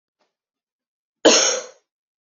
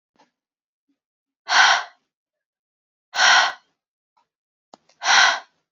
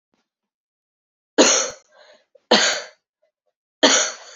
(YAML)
cough_length: 2.2 s
cough_amplitude: 28026
cough_signal_mean_std_ratio: 0.3
exhalation_length: 5.7 s
exhalation_amplitude: 28160
exhalation_signal_mean_std_ratio: 0.34
three_cough_length: 4.4 s
three_cough_amplitude: 28576
three_cough_signal_mean_std_ratio: 0.35
survey_phase: beta (2021-08-13 to 2022-03-07)
age: 18-44
gender: Female
wearing_mask: 'No'
symptom_cough_any: true
symptom_runny_or_blocked_nose: true
symptom_shortness_of_breath: true
symptom_fatigue: true
symptom_headache: true
symptom_change_to_sense_of_smell_or_taste: true
symptom_loss_of_taste: true
symptom_onset: 3 days
smoker_status: Never smoked
respiratory_condition_asthma: false
respiratory_condition_other: false
recruitment_source: Test and Trace
submission_delay: 2 days
covid_test_result: Positive
covid_test_method: RT-qPCR
covid_ct_value: 15.8
covid_ct_gene: ORF1ab gene
covid_ct_mean: 17.0
covid_viral_load: 2700000 copies/ml
covid_viral_load_category: High viral load (>1M copies/ml)